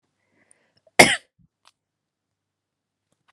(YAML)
cough_length: 3.3 s
cough_amplitude: 32768
cough_signal_mean_std_ratio: 0.14
survey_phase: beta (2021-08-13 to 2022-03-07)
age: 18-44
gender: Female
wearing_mask: 'No'
symptom_other: true
symptom_onset: 9 days
smoker_status: Never smoked
respiratory_condition_asthma: false
respiratory_condition_other: false
recruitment_source: REACT
submission_delay: 1 day
covid_test_result: Negative
covid_test_method: RT-qPCR
influenza_a_test_result: Negative
influenza_b_test_result: Negative